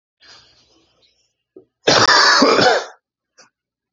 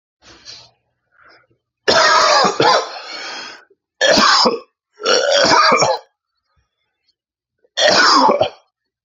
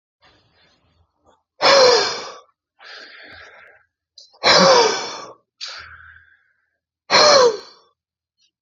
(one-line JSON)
{"cough_length": "3.9 s", "cough_amplitude": 30419, "cough_signal_mean_std_ratio": 0.42, "three_cough_length": "9.0 s", "three_cough_amplitude": 32768, "three_cough_signal_mean_std_ratio": 0.54, "exhalation_length": "8.6 s", "exhalation_amplitude": 31411, "exhalation_signal_mean_std_ratio": 0.38, "survey_phase": "beta (2021-08-13 to 2022-03-07)", "age": "18-44", "gender": "Male", "wearing_mask": "No", "symptom_cough_any": true, "symptom_runny_or_blocked_nose": true, "symptom_sore_throat": true, "symptom_headache": true, "symptom_onset": "4 days", "smoker_status": "Never smoked", "respiratory_condition_asthma": false, "respiratory_condition_other": false, "recruitment_source": "Test and Trace", "submission_delay": "2 days", "covid_test_result": "Positive", "covid_test_method": "RT-qPCR", "covid_ct_value": 20.8, "covid_ct_gene": "ORF1ab gene", "covid_ct_mean": 21.4, "covid_viral_load": "98000 copies/ml", "covid_viral_load_category": "Low viral load (10K-1M copies/ml)"}